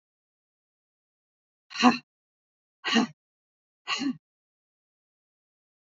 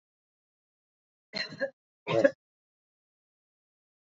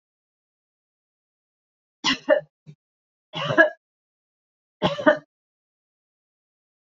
exhalation_length: 5.9 s
exhalation_amplitude: 20312
exhalation_signal_mean_std_ratio: 0.23
cough_length: 4.0 s
cough_amplitude: 11788
cough_signal_mean_std_ratio: 0.21
three_cough_length: 6.8 s
three_cough_amplitude: 25517
three_cough_signal_mean_std_ratio: 0.24
survey_phase: beta (2021-08-13 to 2022-03-07)
age: 45-64
gender: Female
wearing_mask: 'No'
symptom_none: true
smoker_status: Never smoked
respiratory_condition_asthma: false
respiratory_condition_other: false
recruitment_source: REACT
submission_delay: 1 day
covid_test_result: Negative
covid_test_method: RT-qPCR
influenza_a_test_result: Negative
influenza_b_test_result: Negative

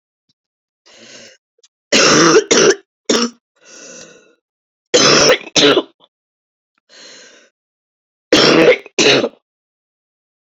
three_cough_length: 10.5 s
three_cough_amplitude: 32767
three_cough_signal_mean_std_ratio: 0.41
survey_phase: beta (2021-08-13 to 2022-03-07)
age: 18-44
gender: Female
wearing_mask: 'No'
symptom_cough_any: true
symptom_runny_or_blocked_nose: true
symptom_shortness_of_breath: true
symptom_sore_throat: true
symptom_abdominal_pain: true
symptom_diarrhoea: true
symptom_fatigue: true
symptom_fever_high_temperature: true
symptom_headache: true
symptom_change_to_sense_of_smell_or_taste: true
symptom_loss_of_taste: true
smoker_status: Ex-smoker
respiratory_condition_asthma: false
respiratory_condition_other: false
recruitment_source: Test and Trace
submission_delay: 2 days
covid_test_result: Positive
covid_test_method: RT-qPCR
covid_ct_value: 27.6
covid_ct_gene: ORF1ab gene
covid_ct_mean: 28.3
covid_viral_load: 510 copies/ml
covid_viral_load_category: Minimal viral load (< 10K copies/ml)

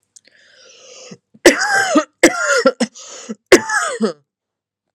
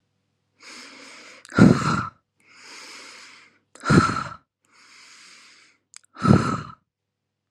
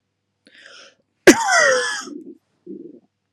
three_cough_length: 4.9 s
three_cough_amplitude: 32768
three_cough_signal_mean_std_ratio: 0.42
exhalation_length: 7.5 s
exhalation_amplitude: 31775
exhalation_signal_mean_std_ratio: 0.31
cough_length: 3.3 s
cough_amplitude: 32768
cough_signal_mean_std_ratio: 0.35
survey_phase: beta (2021-08-13 to 2022-03-07)
age: 18-44
gender: Female
wearing_mask: 'No'
symptom_none: true
smoker_status: Current smoker (e-cigarettes or vapes only)
respiratory_condition_asthma: false
respiratory_condition_other: false
recruitment_source: REACT
submission_delay: 1 day
covid_test_result: Negative
covid_test_method: RT-qPCR
influenza_a_test_result: Negative
influenza_b_test_result: Negative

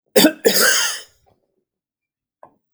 cough_length: 2.7 s
cough_amplitude: 32767
cough_signal_mean_std_ratio: 0.39
survey_phase: alpha (2021-03-01 to 2021-08-12)
age: 45-64
gender: Male
wearing_mask: 'No'
symptom_none: true
smoker_status: Never smoked
respiratory_condition_asthma: false
respiratory_condition_other: false
recruitment_source: REACT
submission_delay: 2 days
covid_test_result: Negative
covid_test_method: RT-qPCR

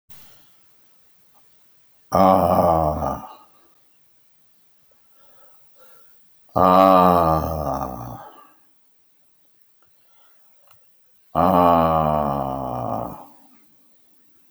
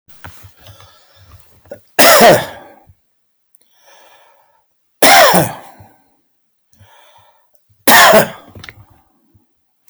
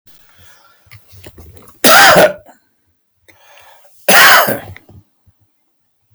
exhalation_length: 14.5 s
exhalation_amplitude: 32508
exhalation_signal_mean_std_ratio: 0.39
three_cough_length: 9.9 s
three_cough_amplitude: 32768
three_cough_signal_mean_std_ratio: 0.34
cough_length: 6.1 s
cough_amplitude: 32768
cough_signal_mean_std_ratio: 0.37
survey_phase: alpha (2021-03-01 to 2021-08-12)
age: 65+
gender: Male
wearing_mask: 'No'
symptom_none: true
smoker_status: Never smoked
respiratory_condition_asthma: false
respiratory_condition_other: false
recruitment_source: REACT
submission_delay: 2 days
covid_test_result: Negative
covid_test_method: RT-qPCR
covid_ct_value: 45.0
covid_ct_gene: N gene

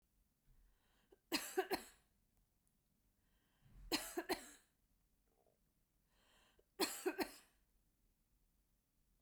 three_cough_length: 9.2 s
three_cough_amplitude: 1957
three_cough_signal_mean_std_ratio: 0.29
survey_phase: beta (2021-08-13 to 2022-03-07)
age: 65+
gender: Female
wearing_mask: 'No'
symptom_none: true
smoker_status: Ex-smoker
respiratory_condition_asthma: false
respiratory_condition_other: false
recruitment_source: REACT
submission_delay: 1 day
covid_test_result: Negative
covid_test_method: RT-qPCR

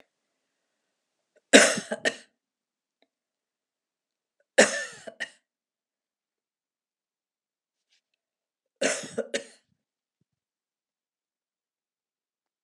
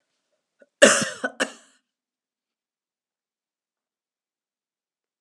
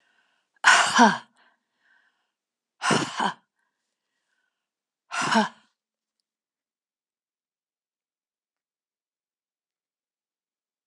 three_cough_length: 12.6 s
three_cough_amplitude: 32469
three_cough_signal_mean_std_ratio: 0.17
cough_length: 5.2 s
cough_amplitude: 32768
cough_signal_mean_std_ratio: 0.18
exhalation_length: 10.9 s
exhalation_amplitude: 25516
exhalation_signal_mean_std_ratio: 0.24
survey_phase: beta (2021-08-13 to 2022-03-07)
age: 65+
gender: Female
wearing_mask: 'No'
symptom_none: true
smoker_status: Never smoked
respiratory_condition_asthma: false
respiratory_condition_other: false
recruitment_source: REACT
submission_delay: 2 days
covid_test_result: Negative
covid_test_method: RT-qPCR
influenza_a_test_result: Negative
influenza_b_test_result: Negative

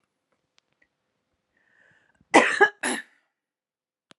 cough_length: 4.2 s
cough_amplitude: 31911
cough_signal_mean_std_ratio: 0.22
survey_phase: beta (2021-08-13 to 2022-03-07)
age: 18-44
gender: Female
wearing_mask: 'No'
symptom_none: true
smoker_status: Never smoked
respiratory_condition_asthma: false
respiratory_condition_other: false
recruitment_source: REACT
submission_delay: 1 day
covid_test_result: Negative
covid_test_method: RT-qPCR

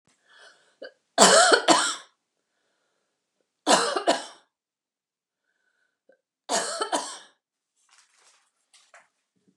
three_cough_length: 9.6 s
three_cough_amplitude: 32750
three_cough_signal_mean_std_ratio: 0.3
survey_phase: beta (2021-08-13 to 2022-03-07)
age: 65+
gender: Female
wearing_mask: 'No'
symptom_none: true
smoker_status: Never smoked
respiratory_condition_asthma: false
respiratory_condition_other: false
recruitment_source: REACT
submission_delay: 0 days
covid_test_result: Negative
covid_test_method: RT-qPCR
covid_ct_value: 39.0
covid_ct_gene: N gene
influenza_a_test_result: Negative
influenza_b_test_result: Negative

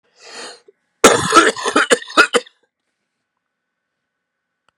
cough_length: 4.8 s
cough_amplitude: 32768
cough_signal_mean_std_ratio: 0.33
survey_phase: beta (2021-08-13 to 2022-03-07)
age: 45-64
gender: Male
wearing_mask: 'No'
symptom_runny_or_blocked_nose: true
symptom_sore_throat: true
symptom_fatigue: true
symptom_headache: true
symptom_onset: 4 days
smoker_status: Ex-smoker
respiratory_condition_asthma: false
respiratory_condition_other: false
recruitment_source: Test and Trace
submission_delay: 1 day
covid_test_result: Positive
covid_test_method: ePCR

